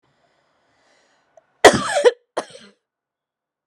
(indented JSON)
{
  "cough_length": "3.7 s",
  "cough_amplitude": 32768,
  "cough_signal_mean_std_ratio": 0.23,
  "survey_phase": "alpha (2021-03-01 to 2021-08-12)",
  "age": "45-64",
  "gender": "Female",
  "wearing_mask": "No",
  "symptom_cough_any": true,
  "symptom_fatigue": true,
  "symptom_headache": true,
  "symptom_onset": "9 days",
  "smoker_status": "Never smoked",
  "respiratory_condition_asthma": false,
  "respiratory_condition_other": false,
  "recruitment_source": "REACT",
  "submission_delay": "2 days",
  "covid_test_result": "Negative",
  "covid_test_method": "RT-qPCR"
}